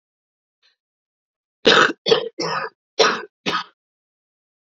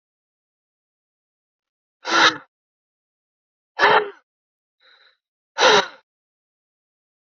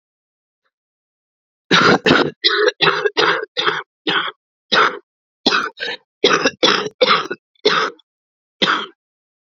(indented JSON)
{
  "three_cough_length": "4.6 s",
  "three_cough_amplitude": 30684,
  "three_cough_signal_mean_std_ratio": 0.34,
  "exhalation_length": "7.3 s",
  "exhalation_amplitude": 27796,
  "exhalation_signal_mean_std_ratio": 0.26,
  "cough_length": "9.6 s",
  "cough_amplitude": 32768,
  "cough_signal_mean_std_ratio": 0.49,
  "survey_phase": "beta (2021-08-13 to 2022-03-07)",
  "age": "18-44",
  "gender": "Female",
  "wearing_mask": "No",
  "symptom_cough_any": true,
  "symptom_runny_or_blocked_nose": true,
  "symptom_shortness_of_breath": true,
  "symptom_diarrhoea": true,
  "symptom_fatigue": true,
  "symptom_headache": true,
  "symptom_change_to_sense_of_smell_or_taste": true,
  "symptom_loss_of_taste": true,
  "smoker_status": "Current smoker (e-cigarettes or vapes only)",
  "respiratory_condition_asthma": true,
  "respiratory_condition_other": false,
  "recruitment_source": "Test and Trace",
  "submission_delay": "2 days",
  "covid_test_result": "Positive",
  "covid_test_method": "RT-qPCR",
  "covid_ct_value": 15.5,
  "covid_ct_gene": "N gene",
  "covid_ct_mean": 16.0,
  "covid_viral_load": "5800000 copies/ml",
  "covid_viral_load_category": "High viral load (>1M copies/ml)"
}